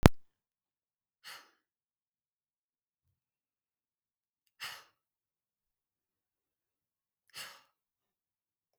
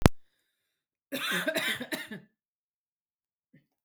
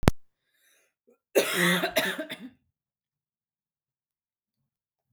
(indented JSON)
{
  "exhalation_length": "8.8 s",
  "exhalation_amplitude": 32768,
  "exhalation_signal_mean_std_ratio": 0.09,
  "cough_length": "3.8 s",
  "cough_amplitude": 32768,
  "cough_signal_mean_std_ratio": 0.32,
  "three_cough_length": "5.1 s",
  "three_cough_amplitude": 32768,
  "three_cough_signal_mean_std_ratio": 0.32,
  "survey_phase": "beta (2021-08-13 to 2022-03-07)",
  "age": "18-44",
  "gender": "Female",
  "wearing_mask": "No",
  "symptom_none": true,
  "smoker_status": "Never smoked",
  "respiratory_condition_asthma": false,
  "respiratory_condition_other": false,
  "recruitment_source": "REACT",
  "submission_delay": "1 day",
  "covid_test_result": "Negative",
  "covid_test_method": "RT-qPCR",
  "influenza_a_test_result": "Negative",
  "influenza_b_test_result": "Negative"
}